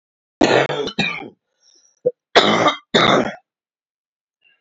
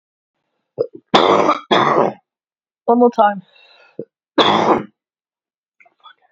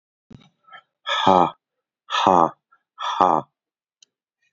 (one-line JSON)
{"cough_length": "4.6 s", "cough_amplitude": 28694, "cough_signal_mean_std_ratio": 0.43, "three_cough_length": "6.3 s", "three_cough_amplitude": 32044, "three_cough_signal_mean_std_ratio": 0.43, "exhalation_length": "4.5 s", "exhalation_amplitude": 29964, "exhalation_signal_mean_std_ratio": 0.34, "survey_phase": "alpha (2021-03-01 to 2021-08-12)", "age": "18-44", "gender": "Male", "wearing_mask": "No", "symptom_cough_any": true, "symptom_new_continuous_cough": true, "symptom_diarrhoea": true, "symptom_fatigue": true, "symptom_fever_high_temperature": true, "symptom_change_to_sense_of_smell_or_taste": true, "symptom_loss_of_taste": true, "symptom_onset": "6 days", "smoker_status": "Ex-smoker", "respiratory_condition_asthma": false, "respiratory_condition_other": false, "recruitment_source": "Test and Trace", "submission_delay": "5 days", "covid_test_result": "Positive", "covid_test_method": "RT-qPCR", "covid_ct_value": 24.1, "covid_ct_gene": "ORF1ab gene"}